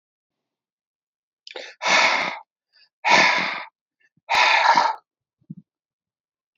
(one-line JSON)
{"exhalation_length": "6.6 s", "exhalation_amplitude": 24783, "exhalation_signal_mean_std_ratio": 0.41, "survey_phase": "alpha (2021-03-01 to 2021-08-12)", "age": "65+", "gender": "Male", "wearing_mask": "No", "symptom_none": true, "smoker_status": "Ex-smoker", "respiratory_condition_asthma": false, "respiratory_condition_other": false, "recruitment_source": "REACT", "submission_delay": "1 day", "covid_test_result": "Negative", "covid_test_method": "RT-qPCR"}